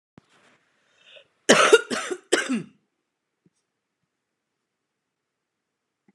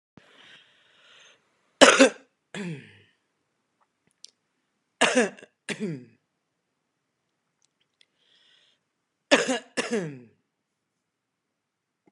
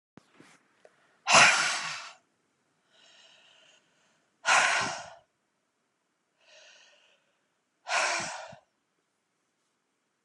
{"cough_length": "6.1 s", "cough_amplitude": 31043, "cough_signal_mean_std_ratio": 0.24, "three_cough_length": "12.1 s", "three_cough_amplitude": 32767, "three_cough_signal_mean_std_ratio": 0.22, "exhalation_length": "10.2 s", "exhalation_amplitude": 17884, "exhalation_signal_mean_std_ratio": 0.29, "survey_phase": "beta (2021-08-13 to 2022-03-07)", "age": "45-64", "gender": "Female", "wearing_mask": "No", "symptom_fatigue": true, "symptom_onset": "13 days", "smoker_status": "Current smoker (11 or more cigarettes per day)", "respiratory_condition_asthma": false, "respiratory_condition_other": false, "recruitment_source": "REACT", "submission_delay": "1 day", "covid_test_result": "Negative", "covid_test_method": "RT-qPCR", "influenza_a_test_result": "Unknown/Void", "influenza_b_test_result": "Unknown/Void"}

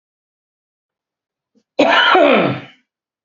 {"cough_length": "3.2 s", "cough_amplitude": 30596, "cough_signal_mean_std_ratio": 0.42, "survey_phase": "beta (2021-08-13 to 2022-03-07)", "age": "45-64", "gender": "Male", "wearing_mask": "No", "symptom_cough_any": true, "smoker_status": "Never smoked", "respiratory_condition_asthma": false, "respiratory_condition_other": false, "recruitment_source": "REACT", "submission_delay": "1 day", "covid_test_result": "Negative", "covid_test_method": "RT-qPCR", "influenza_a_test_result": "Negative", "influenza_b_test_result": "Negative"}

